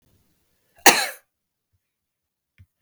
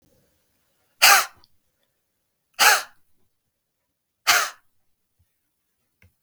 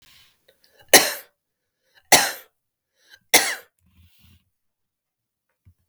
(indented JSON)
{
  "cough_length": "2.8 s",
  "cough_amplitude": 32768,
  "cough_signal_mean_std_ratio": 0.18,
  "exhalation_length": "6.2 s",
  "exhalation_amplitude": 32766,
  "exhalation_signal_mean_std_ratio": 0.24,
  "three_cough_length": "5.9 s",
  "three_cough_amplitude": 32768,
  "three_cough_signal_mean_std_ratio": 0.22,
  "survey_phase": "beta (2021-08-13 to 2022-03-07)",
  "age": "45-64",
  "gender": "Female",
  "wearing_mask": "No",
  "symptom_none": true,
  "smoker_status": "Never smoked",
  "respiratory_condition_asthma": true,
  "respiratory_condition_other": false,
  "recruitment_source": "REACT",
  "submission_delay": "3 days",
  "covid_test_result": "Negative",
  "covid_test_method": "RT-qPCR",
  "influenza_a_test_result": "Negative",
  "influenza_b_test_result": "Negative"
}